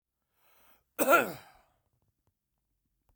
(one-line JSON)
{"cough_length": "3.2 s", "cough_amplitude": 10933, "cough_signal_mean_std_ratio": 0.23, "survey_phase": "beta (2021-08-13 to 2022-03-07)", "age": "45-64", "gender": "Male", "wearing_mask": "No", "symptom_none": true, "smoker_status": "Never smoked", "respiratory_condition_asthma": false, "respiratory_condition_other": false, "recruitment_source": "REACT", "submission_delay": "3 days", "covid_test_result": "Negative", "covid_test_method": "RT-qPCR", "influenza_a_test_result": "Unknown/Void", "influenza_b_test_result": "Unknown/Void"}